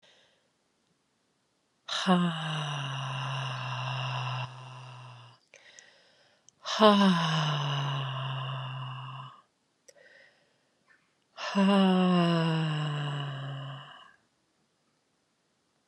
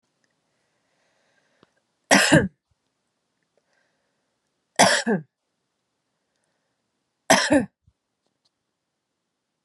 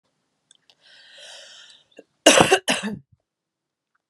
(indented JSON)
{
  "exhalation_length": "15.9 s",
  "exhalation_amplitude": 16760,
  "exhalation_signal_mean_std_ratio": 0.53,
  "three_cough_length": "9.6 s",
  "three_cough_amplitude": 32443,
  "three_cough_signal_mean_std_ratio": 0.24,
  "cough_length": "4.1 s",
  "cough_amplitude": 32768,
  "cough_signal_mean_std_ratio": 0.26,
  "survey_phase": "beta (2021-08-13 to 2022-03-07)",
  "age": "18-44",
  "gender": "Female",
  "wearing_mask": "No",
  "symptom_cough_any": true,
  "symptom_runny_or_blocked_nose": true,
  "symptom_sore_throat": true,
  "smoker_status": "Never smoked",
  "respiratory_condition_asthma": false,
  "respiratory_condition_other": false,
  "recruitment_source": "Test and Trace",
  "submission_delay": "2 days",
  "covid_test_result": "Positive",
  "covid_test_method": "LFT"
}